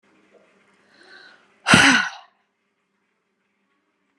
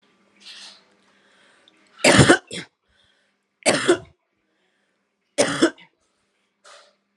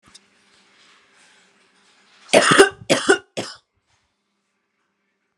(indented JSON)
{
  "exhalation_length": "4.2 s",
  "exhalation_amplitude": 32768,
  "exhalation_signal_mean_std_ratio": 0.25,
  "three_cough_length": "7.2 s",
  "three_cough_amplitude": 32504,
  "three_cough_signal_mean_std_ratio": 0.28,
  "cough_length": "5.4 s",
  "cough_amplitude": 32768,
  "cough_signal_mean_std_ratio": 0.26,
  "survey_phase": "alpha (2021-03-01 to 2021-08-12)",
  "age": "18-44",
  "gender": "Female",
  "wearing_mask": "No",
  "symptom_none": true,
  "smoker_status": "Never smoked",
  "respiratory_condition_asthma": false,
  "respiratory_condition_other": false,
  "recruitment_source": "REACT",
  "submission_delay": "5 days",
  "covid_test_result": "Negative",
  "covid_test_method": "RT-qPCR"
}